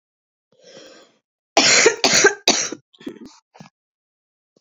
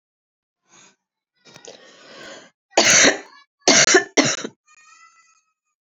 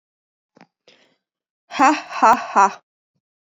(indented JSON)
{
  "cough_length": "4.6 s",
  "cough_amplitude": 32768,
  "cough_signal_mean_std_ratio": 0.35,
  "three_cough_length": "6.0 s",
  "three_cough_amplitude": 32768,
  "three_cough_signal_mean_std_ratio": 0.33,
  "exhalation_length": "3.5 s",
  "exhalation_amplitude": 27941,
  "exhalation_signal_mean_std_ratio": 0.32,
  "survey_phase": "beta (2021-08-13 to 2022-03-07)",
  "age": "18-44",
  "gender": "Female",
  "wearing_mask": "No",
  "symptom_cough_any": true,
  "symptom_new_continuous_cough": true,
  "symptom_runny_or_blocked_nose": true,
  "symptom_shortness_of_breath": true,
  "symptom_sore_throat": true,
  "symptom_abdominal_pain": true,
  "symptom_fatigue": true,
  "symptom_fever_high_temperature": true,
  "symptom_headache": true,
  "symptom_other": true,
  "symptom_onset": "3 days",
  "smoker_status": "Current smoker (1 to 10 cigarettes per day)",
  "respiratory_condition_asthma": false,
  "respiratory_condition_other": false,
  "recruitment_source": "Test and Trace",
  "submission_delay": "1 day",
  "covid_test_result": "Positive",
  "covid_test_method": "RT-qPCR",
  "covid_ct_value": 20.7,
  "covid_ct_gene": "N gene"
}